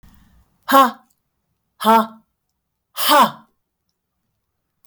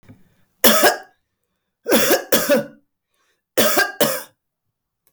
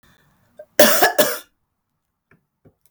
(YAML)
exhalation_length: 4.9 s
exhalation_amplitude: 32766
exhalation_signal_mean_std_ratio: 0.32
three_cough_length: 5.1 s
three_cough_amplitude: 32768
three_cough_signal_mean_std_ratio: 0.45
cough_length: 2.9 s
cough_amplitude: 32768
cough_signal_mean_std_ratio: 0.32
survey_phase: beta (2021-08-13 to 2022-03-07)
age: 65+
gender: Female
wearing_mask: 'No'
symptom_none: true
smoker_status: Ex-smoker
respiratory_condition_asthma: false
respiratory_condition_other: false
recruitment_source: REACT
submission_delay: 3 days
covid_test_result: Negative
covid_test_method: RT-qPCR